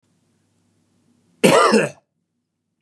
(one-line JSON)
{"cough_length": "2.8 s", "cough_amplitude": 32419, "cough_signal_mean_std_ratio": 0.32, "survey_phase": "beta (2021-08-13 to 2022-03-07)", "age": "45-64", "gender": "Male", "wearing_mask": "No", "symptom_none": true, "smoker_status": "Ex-smoker", "respiratory_condition_asthma": false, "respiratory_condition_other": false, "recruitment_source": "REACT", "submission_delay": "2 days", "covid_test_result": "Negative", "covid_test_method": "RT-qPCR", "influenza_a_test_result": "Negative", "influenza_b_test_result": "Negative"}